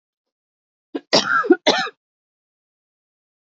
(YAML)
cough_length: 3.5 s
cough_amplitude: 30054
cough_signal_mean_std_ratio: 0.31
survey_phase: beta (2021-08-13 to 2022-03-07)
age: 18-44
gender: Female
wearing_mask: 'No'
symptom_headache: true
smoker_status: Never smoked
respiratory_condition_asthma: false
respiratory_condition_other: false
recruitment_source: REACT
submission_delay: 0 days
covid_test_result: Negative
covid_test_method: RT-qPCR
influenza_a_test_result: Negative
influenza_b_test_result: Negative